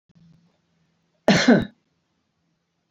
{"cough_length": "2.9 s", "cough_amplitude": 24327, "cough_signal_mean_std_ratio": 0.27, "survey_phase": "alpha (2021-03-01 to 2021-08-12)", "age": "45-64", "gender": "Male", "wearing_mask": "No", "symptom_none": true, "smoker_status": "Never smoked", "respiratory_condition_asthma": false, "respiratory_condition_other": false, "recruitment_source": "REACT", "submission_delay": "1 day", "covid_test_result": "Negative", "covid_test_method": "RT-qPCR"}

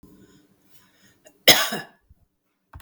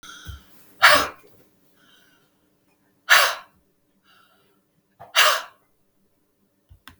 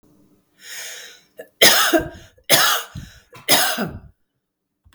{"cough_length": "2.8 s", "cough_amplitude": 32768, "cough_signal_mean_std_ratio": 0.22, "exhalation_length": "7.0 s", "exhalation_amplitude": 32768, "exhalation_signal_mean_std_ratio": 0.26, "three_cough_length": "4.9 s", "three_cough_amplitude": 32768, "three_cough_signal_mean_std_ratio": 0.41, "survey_phase": "beta (2021-08-13 to 2022-03-07)", "age": "45-64", "gender": "Female", "wearing_mask": "No", "symptom_none": true, "smoker_status": "Ex-smoker", "respiratory_condition_asthma": false, "respiratory_condition_other": false, "recruitment_source": "REACT", "submission_delay": "2 days", "covid_test_result": "Negative", "covid_test_method": "RT-qPCR", "influenza_a_test_result": "Negative", "influenza_b_test_result": "Negative"}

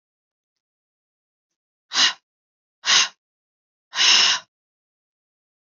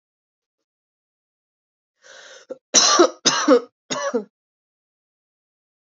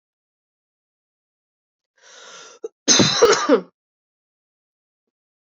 {"exhalation_length": "5.6 s", "exhalation_amplitude": 23495, "exhalation_signal_mean_std_ratio": 0.3, "three_cough_length": "5.9 s", "three_cough_amplitude": 32080, "three_cough_signal_mean_std_ratio": 0.3, "cough_length": "5.5 s", "cough_amplitude": 31254, "cough_signal_mean_std_ratio": 0.28, "survey_phase": "beta (2021-08-13 to 2022-03-07)", "age": "18-44", "gender": "Female", "wearing_mask": "No", "symptom_cough_any": true, "symptom_runny_or_blocked_nose": true, "symptom_fever_high_temperature": true, "symptom_change_to_sense_of_smell_or_taste": true, "symptom_loss_of_taste": true, "symptom_onset": "5 days", "smoker_status": "Never smoked", "respiratory_condition_asthma": false, "respiratory_condition_other": false, "recruitment_source": "Test and Trace", "submission_delay": "2 days", "covid_test_result": "Positive", "covid_test_method": "ePCR"}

